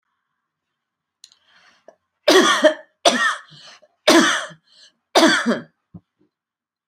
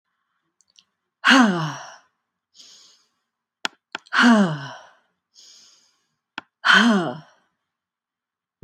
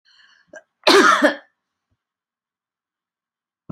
three_cough_length: 6.9 s
three_cough_amplitude: 30890
three_cough_signal_mean_std_ratio: 0.37
exhalation_length: 8.6 s
exhalation_amplitude: 26593
exhalation_signal_mean_std_ratio: 0.33
cough_length: 3.7 s
cough_amplitude: 29778
cough_signal_mean_std_ratio: 0.29
survey_phase: beta (2021-08-13 to 2022-03-07)
age: 45-64
gender: Female
wearing_mask: 'No'
symptom_none: true
smoker_status: Never smoked
respiratory_condition_asthma: false
respiratory_condition_other: false
recruitment_source: REACT
submission_delay: 4 days
covid_test_result: Negative
covid_test_method: RT-qPCR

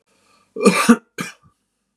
cough_length: 2.0 s
cough_amplitude: 32767
cough_signal_mean_std_ratio: 0.33
survey_phase: beta (2021-08-13 to 2022-03-07)
age: 45-64
gender: Male
wearing_mask: 'No'
symptom_none: true
smoker_status: Ex-smoker
respiratory_condition_asthma: false
respiratory_condition_other: false
recruitment_source: REACT
submission_delay: -1 day
covid_test_result: Negative
covid_test_method: RT-qPCR
influenza_a_test_result: Unknown/Void
influenza_b_test_result: Unknown/Void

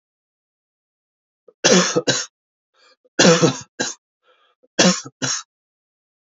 three_cough_length: 6.4 s
three_cough_amplitude: 31081
three_cough_signal_mean_std_ratio: 0.34
survey_phase: beta (2021-08-13 to 2022-03-07)
age: 18-44
gender: Male
wearing_mask: 'No'
symptom_cough_any: true
symptom_runny_or_blocked_nose: true
symptom_sore_throat: true
symptom_onset: 3 days
smoker_status: Ex-smoker
respiratory_condition_asthma: false
respiratory_condition_other: false
recruitment_source: Test and Trace
submission_delay: 1 day
covid_test_result: Positive
covid_test_method: RT-qPCR
covid_ct_value: 22.1
covid_ct_gene: ORF1ab gene
covid_ct_mean: 22.6
covid_viral_load: 38000 copies/ml
covid_viral_load_category: Low viral load (10K-1M copies/ml)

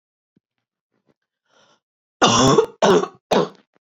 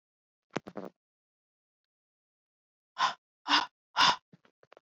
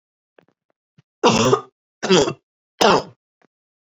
cough_length: 3.9 s
cough_amplitude: 31945
cough_signal_mean_std_ratio: 0.37
exhalation_length: 4.9 s
exhalation_amplitude: 9094
exhalation_signal_mean_std_ratio: 0.25
three_cough_length: 3.9 s
three_cough_amplitude: 31592
three_cough_signal_mean_std_ratio: 0.36
survey_phase: beta (2021-08-13 to 2022-03-07)
age: 18-44
gender: Female
wearing_mask: 'No'
symptom_cough_any: true
symptom_runny_or_blocked_nose: true
symptom_shortness_of_breath: true
symptom_sore_throat: true
symptom_headache: true
smoker_status: Never smoked
respiratory_condition_asthma: false
respiratory_condition_other: false
recruitment_source: Test and Trace
submission_delay: 1 day
covid_test_result: Positive
covid_test_method: RT-qPCR
covid_ct_value: 21.9
covid_ct_gene: ORF1ab gene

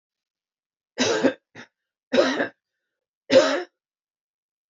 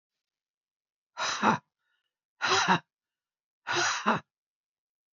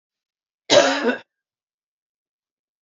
three_cough_length: 4.7 s
three_cough_amplitude: 23084
three_cough_signal_mean_std_ratio: 0.34
exhalation_length: 5.1 s
exhalation_amplitude: 13465
exhalation_signal_mean_std_ratio: 0.37
cough_length: 2.8 s
cough_amplitude: 26287
cough_signal_mean_std_ratio: 0.29
survey_phase: beta (2021-08-13 to 2022-03-07)
age: 45-64
gender: Female
wearing_mask: 'No'
symptom_cough_any: true
symptom_shortness_of_breath: true
symptom_headache: true
symptom_other: true
smoker_status: Ex-smoker
respiratory_condition_asthma: false
respiratory_condition_other: false
recruitment_source: Test and Trace
submission_delay: 2 days
covid_test_result: Positive
covid_test_method: RT-qPCR
covid_ct_value: 14.9
covid_ct_gene: ORF1ab gene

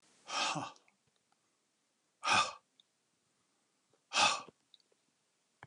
exhalation_length: 5.7 s
exhalation_amplitude: 6367
exhalation_signal_mean_std_ratio: 0.3
survey_phase: alpha (2021-03-01 to 2021-08-12)
age: 45-64
gender: Male
wearing_mask: 'No'
symptom_none: true
smoker_status: Never smoked
respiratory_condition_asthma: false
respiratory_condition_other: false
recruitment_source: REACT
submission_delay: 5 days
covid_test_result: Negative
covid_test_method: RT-qPCR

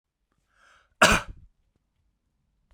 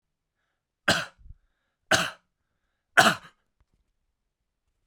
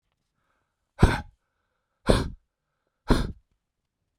cough_length: 2.7 s
cough_amplitude: 24437
cough_signal_mean_std_ratio: 0.21
three_cough_length: 4.9 s
three_cough_amplitude: 27030
three_cough_signal_mean_std_ratio: 0.23
exhalation_length: 4.2 s
exhalation_amplitude: 27025
exhalation_signal_mean_std_ratio: 0.26
survey_phase: beta (2021-08-13 to 2022-03-07)
age: 45-64
gender: Male
wearing_mask: 'No'
symptom_none: true
smoker_status: Never smoked
respiratory_condition_asthma: false
respiratory_condition_other: false
recruitment_source: REACT
submission_delay: 2 days
covid_test_result: Negative
covid_test_method: RT-qPCR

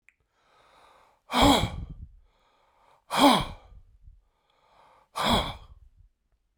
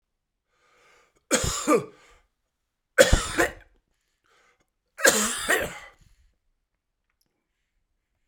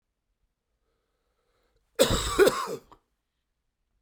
exhalation_length: 6.6 s
exhalation_amplitude: 15003
exhalation_signal_mean_std_ratio: 0.33
three_cough_length: 8.3 s
three_cough_amplitude: 32767
three_cough_signal_mean_std_ratio: 0.3
cough_length: 4.0 s
cough_amplitude: 16163
cough_signal_mean_std_ratio: 0.29
survey_phase: beta (2021-08-13 to 2022-03-07)
age: 65+
gender: Male
wearing_mask: 'No'
symptom_cough_any: true
symptom_runny_or_blocked_nose: true
symptom_shortness_of_breath: true
symptom_sore_throat: true
symptom_fatigue: true
symptom_headache: true
symptom_change_to_sense_of_smell_or_taste: true
symptom_loss_of_taste: true
symptom_onset: 5 days
smoker_status: Never smoked
respiratory_condition_asthma: false
respiratory_condition_other: false
recruitment_source: Test and Trace
submission_delay: 2 days
covid_test_result: Positive
covid_test_method: RT-qPCR
covid_ct_value: 13.9
covid_ct_gene: ORF1ab gene
covid_ct_mean: 14.3
covid_viral_load: 21000000 copies/ml
covid_viral_load_category: High viral load (>1M copies/ml)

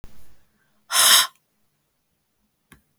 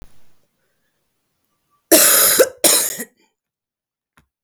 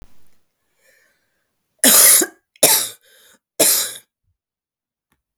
exhalation_length: 3.0 s
exhalation_amplitude: 31732
exhalation_signal_mean_std_ratio: 0.3
cough_length: 4.4 s
cough_amplitude: 32768
cough_signal_mean_std_ratio: 0.36
three_cough_length: 5.4 s
three_cough_amplitude: 32766
three_cough_signal_mean_std_ratio: 0.34
survey_phase: beta (2021-08-13 to 2022-03-07)
age: 18-44
gender: Female
wearing_mask: 'No'
symptom_cough_any: true
symptom_runny_or_blocked_nose: true
smoker_status: Ex-smoker
respiratory_condition_asthma: false
respiratory_condition_other: false
recruitment_source: REACT
submission_delay: 1 day
covid_test_result: Negative
covid_test_method: RT-qPCR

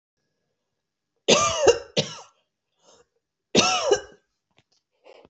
cough_length: 5.3 s
cough_amplitude: 25957
cough_signal_mean_std_ratio: 0.34
survey_phase: alpha (2021-03-01 to 2021-08-12)
age: 45-64
gender: Female
wearing_mask: 'No'
symptom_cough_any: true
symptom_headache: true
symptom_onset: 9 days
smoker_status: Never smoked
respiratory_condition_asthma: false
respiratory_condition_other: false
recruitment_source: Test and Trace
submission_delay: 2 days
covid_test_result: Positive
covid_test_method: RT-qPCR
covid_ct_value: 23.4
covid_ct_gene: ORF1ab gene
covid_ct_mean: 24.4
covid_viral_load: 9700 copies/ml
covid_viral_load_category: Minimal viral load (< 10K copies/ml)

